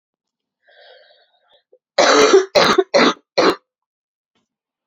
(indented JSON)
{
  "cough_length": "4.9 s",
  "cough_amplitude": 31939,
  "cough_signal_mean_std_ratio": 0.39,
  "survey_phase": "beta (2021-08-13 to 2022-03-07)",
  "age": "18-44",
  "gender": "Female",
  "wearing_mask": "No",
  "symptom_cough_any": true,
  "symptom_runny_or_blocked_nose": true,
  "symptom_shortness_of_breath": true,
  "symptom_headache": true,
  "symptom_onset": "2 days",
  "smoker_status": "Ex-smoker",
  "respiratory_condition_asthma": false,
  "respiratory_condition_other": false,
  "recruitment_source": "Test and Trace",
  "submission_delay": "0 days",
  "covid_test_result": "Positive",
  "covid_test_method": "LAMP"
}